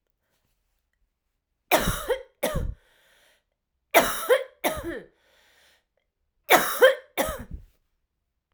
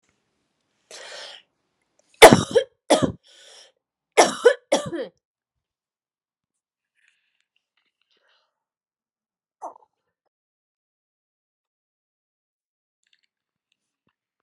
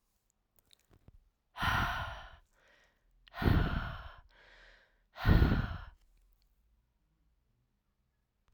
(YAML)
three_cough_length: 8.5 s
three_cough_amplitude: 28597
three_cough_signal_mean_std_ratio: 0.33
cough_length: 14.4 s
cough_amplitude: 32768
cough_signal_mean_std_ratio: 0.16
exhalation_length: 8.5 s
exhalation_amplitude: 6714
exhalation_signal_mean_std_ratio: 0.34
survey_phase: alpha (2021-03-01 to 2021-08-12)
age: 18-44
gender: Female
wearing_mask: 'No'
symptom_cough_any: true
symptom_new_continuous_cough: true
symptom_abdominal_pain: true
symptom_diarrhoea: true
symptom_fatigue: true
symptom_headache: true
symptom_change_to_sense_of_smell_or_taste: true
symptom_loss_of_taste: true
symptom_onset: 2 days
smoker_status: Never smoked
respiratory_condition_asthma: false
respiratory_condition_other: false
recruitment_source: Test and Trace
submission_delay: 2 days
covid_test_result: Positive
covid_test_method: RT-qPCR
covid_ct_value: 15.1
covid_ct_gene: ORF1ab gene
covid_ct_mean: 15.4
covid_viral_load: 8800000 copies/ml
covid_viral_load_category: High viral load (>1M copies/ml)